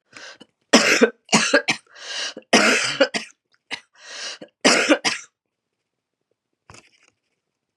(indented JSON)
{
  "three_cough_length": "7.8 s",
  "three_cough_amplitude": 31959,
  "three_cough_signal_mean_std_ratio": 0.39,
  "survey_phase": "beta (2021-08-13 to 2022-03-07)",
  "age": "65+",
  "gender": "Female",
  "wearing_mask": "No",
  "symptom_cough_any": true,
  "symptom_runny_or_blocked_nose": true,
  "symptom_fatigue": true,
  "symptom_onset": "3 days",
  "smoker_status": "Never smoked",
  "respiratory_condition_asthma": false,
  "respiratory_condition_other": false,
  "recruitment_source": "Test and Trace",
  "submission_delay": "1 day",
  "covid_test_result": "Positive",
  "covid_test_method": "ePCR"
}